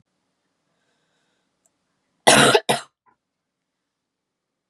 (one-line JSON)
{"cough_length": "4.7 s", "cough_amplitude": 32397, "cough_signal_mean_std_ratio": 0.23, "survey_phase": "beta (2021-08-13 to 2022-03-07)", "age": "18-44", "gender": "Female", "wearing_mask": "No", "symptom_runny_or_blocked_nose": true, "symptom_sore_throat": true, "symptom_headache": true, "symptom_onset": "1 day", "smoker_status": "Never smoked", "respiratory_condition_asthma": false, "respiratory_condition_other": false, "recruitment_source": "Test and Trace", "submission_delay": "1 day", "covid_test_result": "Positive", "covid_test_method": "RT-qPCR", "covid_ct_value": 30.7, "covid_ct_gene": "N gene"}